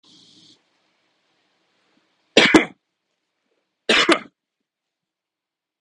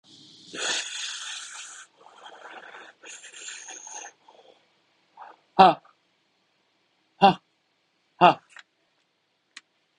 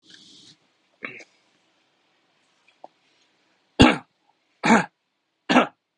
{"cough_length": "5.8 s", "cough_amplitude": 32768, "cough_signal_mean_std_ratio": 0.23, "exhalation_length": "10.0 s", "exhalation_amplitude": 29776, "exhalation_signal_mean_std_ratio": 0.23, "three_cough_length": "6.0 s", "three_cough_amplitude": 31824, "three_cough_signal_mean_std_ratio": 0.23, "survey_phase": "beta (2021-08-13 to 2022-03-07)", "age": "18-44", "gender": "Male", "wearing_mask": "Yes", "symptom_none": true, "smoker_status": "Never smoked", "respiratory_condition_asthma": false, "respiratory_condition_other": false, "recruitment_source": "REACT", "submission_delay": "2 days", "covid_test_result": "Negative", "covid_test_method": "RT-qPCR", "influenza_a_test_result": "Negative", "influenza_b_test_result": "Negative"}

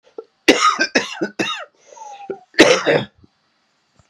{"cough_length": "4.1 s", "cough_amplitude": 32768, "cough_signal_mean_std_ratio": 0.41, "survey_phase": "beta (2021-08-13 to 2022-03-07)", "age": "45-64", "gender": "Male", "wearing_mask": "No", "symptom_cough_any": true, "symptom_runny_or_blocked_nose": true, "symptom_sore_throat": true, "symptom_abdominal_pain": true, "symptom_fatigue": true, "symptom_headache": true, "symptom_onset": "3 days", "smoker_status": "Never smoked", "respiratory_condition_asthma": false, "respiratory_condition_other": false, "recruitment_source": "Test and Trace", "submission_delay": "2 days", "covid_test_result": "Positive", "covid_test_method": "RT-qPCR", "covid_ct_value": 11.9, "covid_ct_gene": "N gene", "covid_ct_mean": 12.4, "covid_viral_load": "85000000 copies/ml", "covid_viral_load_category": "High viral load (>1M copies/ml)"}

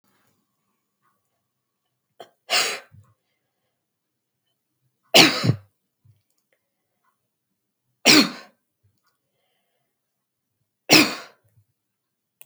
{"three_cough_length": "12.5 s", "three_cough_amplitude": 32768, "three_cough_signal_mean_std_ratio": 0.21, "survey_phase": "beta (2021-08-13 to 2022-03-07)", "age": "65+", "gender": "Female", "wearing_mask": "No", "symptom_none": true, "smoker_status": "Ex-smoker", "respiratory_condition_asthma": false, "respiratory_condition_other": false, "recruitment_source": "REACT", "submission_delay": "2 days", "covid_test_result": "Negative", "covid_test_method": "RT-qPCR", "influenza_a_test_result": "Negative", "influenza_b_test_result": "Negative"}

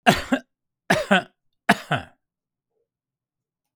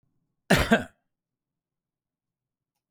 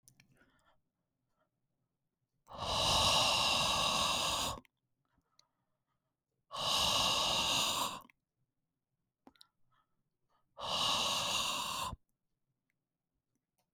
{"three_cough_length": "3.8 s", "three_cough_amplitude": 31791, "three_cough_signal_mean_std_ratio": 0.3, "cough_length": "2.9 s", "cough_amplitude": 18172, "cough_signal_mean_std_ratio": 0.23, "exhalation_length": "13.7 s", "exhalation_amplitude": 4373, "exhalation_signal_mean_std_ratio": 0.51, "survey_phase": "beta (2021-08-13 to 2022-03-07)", "age": "65+", "gender": "Male", "wearing_mask": "No", "symptom_none": true, "smoker_status": "Ex-smoker", "respiratory_condition_asthma": false, "respiratory_condition_other": false, "recruitment_source": "REACT", "submission_delay": "1 day", "covid_test_result": "Negative", "covid_test_method": "RT-qPCR", "influenza_a_test_result": "Negative", "influenza_b_test_result": "Negative"}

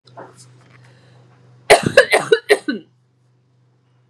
{"cough_length": "4.1 s", "cough_amplitude": 32768, "cough_signal_mean_std_ratio": 0.29, "survey_phase": "beta (2021-08-13 to 2022-03-07)", "age": "18-44", "gender": "Female", "wearing_mask": "No", "symptom_runny_or_blocked_nose": true, "symptom_fatigue": true, "smoker_status": "Ex-smoker", "respiratory_condition_asthma": false, "respiratory_condition_other": false, "recruitment_source": "REACT", "submission_delay": "1 day", "covid_test_result": "Negative", "covid_test_method": "RT-qPCR", "influenza_a_test_result": "Negative", "influenza_b_test_result": "Negative"}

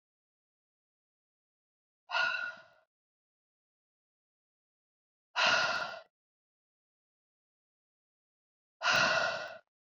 {"exhalation_length": "10.0 s", "exhalation_amplitude": 5867, "exhalation_signal_mean_std_ratio": 0.31, "survey_phase": "beta (2021-08-13 to 2022-03-07)", "age": "18-44", "gender": "Female", "wearing_mask": "No", "symptom_cough_any": true, "symptom_runny_or_blocked_nose": true, "symptom_fatigue": true, "symptom_headache": true, "symptom_onset": "3 days", "smoker_status": "Never smoked", "respiratory_condition_asthma": false, "respiratory_condition_other": false, "recruitment_source": "Test and Trace", "submission_delay": "2 days", "covid_test_result": "Positive", "covid_test_method": "RT-qPCR"}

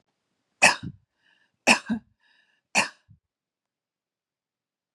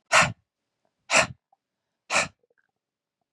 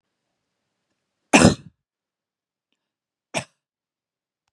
{"three_cough_length": "4.9 s", "three_cough_amplitude": 24710, "three_cough_signal_mean_std_ratio": 0.22, "exhalation_length": "3.3 s", "exhalation_amplitude": 20661, "exhalation_signal_mean_std_ratio": 0.29, "cough_length": "4.5 s", "cough_amplitude": 32767, "cough_signal_mean_std_ratio": 0.17, "survey_phase": "beta (2021-08-13 to 2022-03-07)", "age": "18-44", "gender": "Female", "wearing_mask": "No", "symptom_sore_throat": true, "symptom_onset": "2 days", "smoker_status": "Ex-smoker", "respiratory_condition_asthma": false, "respiratory_condition_other": false, "recruitment_source": "REACT", "submission_delay": "2 days", "covid_test_result": "Positive", "covid_test_method": "RT-qPCR", "covid_ct_value": 35.1, "covid_ct_gene": "E gene", "influenza_a_test_result": "Negative", "influenza_b_test_result": "Negative"}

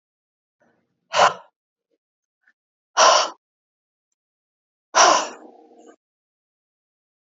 {"exhalation_length": "7.3 s", "exhalation_amplitude": 28517, "exhalation_signal_mean_std_ratio": 0.26, "survey_phase": "beta (2021-08-13 to 2022-03-07)", "age": "45-64", "gender": "Female", "wearing_mask": "No", "symptom_cough_any": true, "symptom_fatigue": true, "symptom_headache": true, "symptom_onset": "6 days", "smoker_status": "Current smoker (1 to 10 cigarettes per day)", "respiratory_condition_asthma": false, "respiratory_condition_other": false, "recruitment_source": "Test and Trace", "submission_delay": "2 days", "covid_test_result": "Negative", "covid_test_method": "RT-qPCR"}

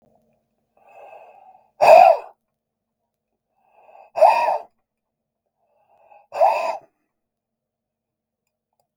{"exhalation_length": "9.0 s", "exhalation_amplitude": 32768, "exhalation_signal_mean_std_ratio": 0.26, "survey_phase": "beta (2021-08-13 to 2022-03-07)", "age": "45-64", "gender": "Male", "wearing_mask": "No", "symptom_none": true, "smoker_status": "Never smoked", "respiratory_condition_asthma": false, "respiratory_condition_other": false, "recruitment_source": "REACT", "submission_delay": "3 days", "covid_test_result": "Negative", "covid_test_method": "RT-qPCR", "influenza_a_test_result": "Negative", "influenza_b_test_result": "Negative"}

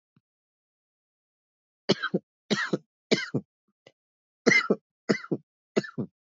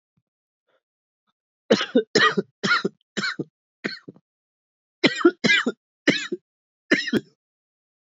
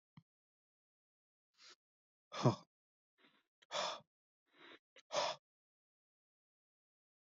{"three_cough_length": "6.4 s", "three_cough_amplitude": 18890, "three_cough_signal_mean_std_ratio": 0.3, "cough_length": "8.2 s", "cough_amplitude": 23812, "cough_signal_mean_std_ratio": 0.35, "exhalation_length": "7.3 s", "exhalation_amplitude": 3653, "exhalation_signal_mean_std_ratio": 0.22, "survey_phase": "beta (2021-08-13 to 2022-03-07)", "age": "18-44", "gender": "Male", "wearing_mask": "No", "symptom_cough_any": true, "symptom_sore_throat": true, "symptom_abdominal_pain": true, "symptom_onset": "3 days", "smoker_status": "Never smoked", "respiratory_condition_asthma": false, "respiratory_condition_other": false, "recruitment_source": "Test and Trace", "submission_delay": "2 days", "covid_test_result": "Positive", "covid_test_method": "RT-qPCR", "covid_ct_value": 17.3, "covid_ct_gene": "N gene"}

